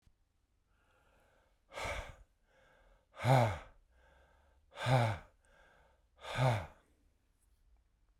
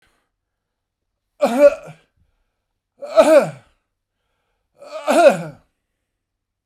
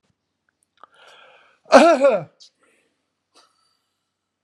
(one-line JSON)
{"exhalation_length": "8.2 s", "exhalation_amplitude": 5701, "exhalation_signal_mean_std_ratio": 0.32, "three_cough_length": "6.7 s", "three_cough_amplitude": 32768, "three_cough_signal_mean_std_ratio": 0.31, "cough_length": "4.4 s", "cough_amplitude": 32768, "cough_signal_mean_std_ratio": 0.26, "survey_phase": "alpha (2021-03-01 to 2021-08-12)", "age": "65+", "gender": "Male", "wearing_mask": "No", "symptom_none": true, "smoker_status": "Ex-smoker", "respiratory_condition_asthma": false, "respiratory_condition_other": false, "recruitment_source": "REACT", "submission_delay": "2 days", "covid_test_result": "Negative", "covid_test_method": "RT-qPCR"}